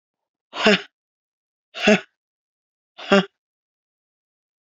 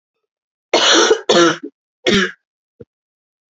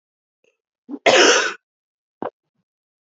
{"exhalation_length": "4.6 s", "exhalation_amplitude": 32767, "exhalation_signal_mean_std_ratio": 0.25, "three_cough_length": "3.6 s", "three_cough_amplitude": 28933, "three_cough_signal_mean_std_ratio": 0.43, "cough_length": "3.1 s", "cough_amplitude": 30203, "cough_signal_mean_std_ratio": 0.32, "survey_phase": "beta (2021-08-13 to 2022-03-07)", "age": "18-44", "gender": "Female", "wearing_mask": "No", "symptom_cough_any": true, "symptom_new_continuous_cough": true, "symptom_fatigue": true, "symptom_headache": true, "symptom_onset": "4 days", "smoker_status": "Never smoked", "respiratory_condition_asthma": false, "respiratory_condition_other": false, "recruitment_source": "REACT", "submission_delay": "2 days", "covid_test_result": "Negative", "covid_test_method": "RT-qPCR"}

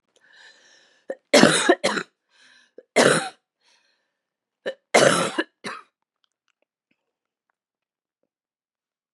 {"three_cough_length": "9.1 s", "three_cough_amplitude": 31196, "three_cough_signal_mean_std_ratio": 0.28, "survey_phase": "beta (2021-08-13 to 2022-03-07)", "age": "45-64", "gender": "Male", "wearing_mask": "No", "symptom_cough_any": true, "symptom_new_continuous_cough": true, "symptom_sore_throat": true, "symptom_fatigue": true, "symptom_change_to_sense_of_smell_or_taste": true, "smoker_status": "Ex-smoker", "respiratory_condition_asthma": true, "respiratory_condition_other": false, "recruitment_source": "Test and Trace", "submission_delay": "2 days", "covid_test_result": "Positive", "covid_test_method": "RT-qPCR"}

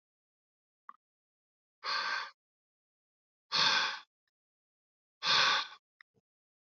{"exhalation_length": "6.7 s", "exhalation_amplitude": 6507, "exhalation_signal_mean_std_ratio": 0.34, "survey_phase": "beta (2021-08-13 to 2022-03-07)", "age": "65+", "gender": "Male", "wearing_mask": "No", "symptom_none": true, "smoker_status": "Never smoked", "respiratory_condition_asthma": false, "respiratory_condition_other": false, "recruitment_source": "REACT", "submission_delay": "2 days", "covid_test_result": "Negative", "covid_test_method": "RT-qPCR"}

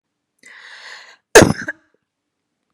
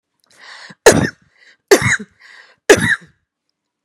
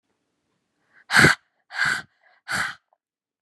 {"cough_length": "2.7 s", "cough_amplitude": 32768, "cough_signal_mean_std_ratio": 0.21, "three_cough_length": "3.8 s", "three_cough_amplitude": 32768, "three_cough_signal_mean_std_ratio": 0.32, "exhalation_length": "3.4 s", "exhalation_amplitude": 32340, "exhalation_signal_mean_std_ratio": 0.31, "survey_phase": "beta (2021-08-13 to 2022-03-07)", "age": "18-44", "gender": "Female", "wearing_mask": "No", "symptom_none": true, "smoker_status": "Never smoked", "respiratory_condition_asthma": false, "respiratory_condition_other": false, "recruitment_source": "REACT", "submission_delay": "1 day", "covid_test_result": "Negative", "covid_test_method": "RT-qPCR"}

